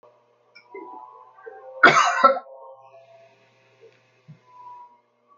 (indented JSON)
{
  "cough_length": "5.4 s",
  "cough_amplitude": 31346,
  "cough_signal_mean_std_ratio": 0.27,
  "survey_phase": "alpha (2021-03-01 to 2021-08-12)",
  "age": "65+",
  "gender": "Male",
  "wearing_mask": "No",
  "symptom_none": true,
  "smoker_status": "Never smoked",
  "respiratory_condition_asthma": false,
  "respiratory_condition_other": false,
  "recruitment_source": "REACT",
  "submission_delay": "2 days",
  "covid_test_result": "Negative",
  "covid_test_method": "RT-qPCR"
}